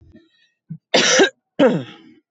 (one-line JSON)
{"cough_length": "2.3 s", "cough_amplitude": 25917, "cough_signal_mean_std_ratio": 0.43, "survey_phase": "beta (2021-08-13 to 2022-03-07)", "age": "18-44", "gender": "Female", "wearing_mask": "No", "symptom_cough_any": true, "symptom_runny_or_blocked_nose": true, "symptom_onset": "4 days", "smoker_status": "Current smoker (11 or more cigarettes per day)", "respiratory_condition_asthma": false, "respiratory_condition_other": false, "recruitment_source": "Test and Trace", "submission_delay": "2 days", "covid_test_result": "Negative", "covid_test_method": "RT-qPCR"}